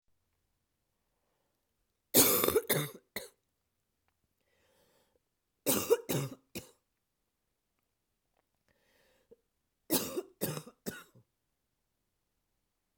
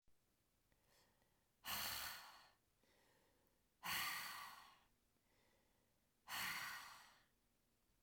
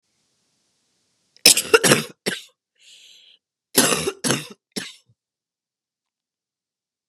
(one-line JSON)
{"three_cough_length": "13.0 s", "three_cough_amplitude": 12703, "three_cough_signal_mean_std_ratio": 0.26, "exhalation_length": "8.0 s", "exhalation_amplitude": 919, "exhalation_signal_mean_std_ratio": 0.44, "cough_length": "7.1 s", "cough_amplitude": 32768, "cough_signal_mean_std_ratio": 0.27, "survey_phase": "beta (2021-08-13 to 2022-03-07)", "age": "45-64", "gender": "Female", "wearing_mask": "No", "symptom_cough_any": true, "symptom_runny_or_blocked_nose": true, "symptom_sore_throat": true, "symptom_headache": true, "smoker_status": "Never smoked", "respiratory_condition_asthma": false, "respiratory_condition_other": false, "recruitment_source": "Test and Trace", "submission_delay": "2 days", "covid_test_result": "Positive", "covid_test_method": "RT-qPCR", "covid_ct_value": 21.4, "covid_ct_gene": "ORF1ab gene"}